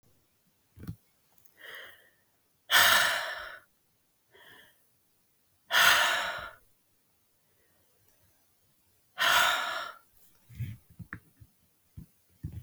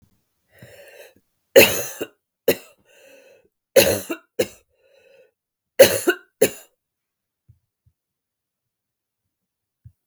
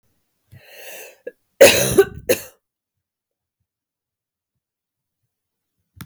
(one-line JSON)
{"exhalation_length": "12.6 s", "exhalation_amplitude": 13760, "exhalation_signal_mean_std_ratio": 0.34, "three_cough_length": "10.1 s", "three_cough_amplitude": 32768, "three_cough_signal_mean_std_ratio": 0.23, "cough_length": "6.1 s", "cough_amplitude": 32768, "cough_signal_mean_std_ratio": 0.22, "survey_phase": "beta (2021-08-13 to 2022-03-07)", "age": "45-64", "gender": "Female", "wearing_mask": "No", "symptom_runny_or_blocked_nose": true, "symptom_sore_throat": true, "symptom_fatigue": true, "symptom_headache": true, "symptom_onset": "2 days", "smoker_status": "Never smoked", "respiratory_condition_asthma": false, "respiratory_condition_other": false, "recruitment_source": "Test and Trace", "submission_delay": "1 day", "covid_test_result": "Positive", "covid_test_method": "RT-qPCR", "covid_ct_value": 21.5, "covid_ct_gene": "ORF1ab gene", "covid_ct_mean": 21.9, "covid_viral_load": "64000 copies/ml", "covid_viral_load_category": "Low viral load (10K-1M copies/ml)"}